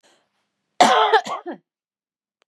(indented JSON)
{
  "cough_length": "2.5 s",
  "cough_amplitude": 32561,
  "cough_signal_mean_std_ratio": 0.35,
  "survey_phase": "beta (2021-08-13 to 2022-03-07)",
  "age": "45-64",
  "gender": "Female",
  "wearing_mask": "No",
  "symptom_cough_any": true,
  "symptom_shortness_of_breath": true,
  "symptom_sore_throat": true,
  "symptom_fatigue": true,
  "symptom_change_to_sense_of_smell_or_taste": true,
  "symptom_onset": "4 days",
  "smoker_status": "Ex-smoker",
  "respiratory_condition_asthma": false,
  "respiratory_condition_other": false,
  "recruitment_source": "Test and Trace",
  "submission_delay": "2 days",
  "covid_test_result": "Positive",
  "covid_test_method": "RT-qPCR",
  "covid_ct_value": 27.4,
  "covid_ct_gene": "N gene"
}